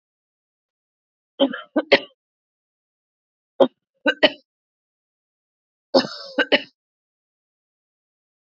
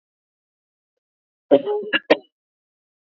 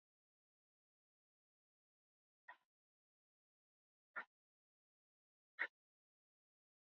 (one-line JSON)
{"three_cough_length": "8.5 s", "three_cough_amplitude": 32768, "three_cough_signal_mean_std_ratio": 0.22, "cough_length": "3.1 s", "cough_amplitude": 27950, "cough_signal_mean_std_ratio": 0.25, "exhalation_length": "7.0 s", "exhalation_amplitude": 1251, "exhalation_signal_mean_std_ratio": 0.11, "survey_phase": "beta (2021-08-13 to 2022-03-07)", "age": "45-64", "gender": "Female", "wearing_mask": "No", "symptom_cough_any": true, "symptom_sore_throat": true, "symptom_fatigue": true, "symptom_onset": "3 days", "smoker_status": "Never smoked", "respiratory_condition_asthma": false, "respiratory_condition_other": false, "recruitment_source": "Test and Trace", "submission_delay": "1 day", "covid_test_result": "Positive", "covid_test_method": "RT-qPCR", "covid_ct_value": 26.8, "covid_ct_gene": "N gene"}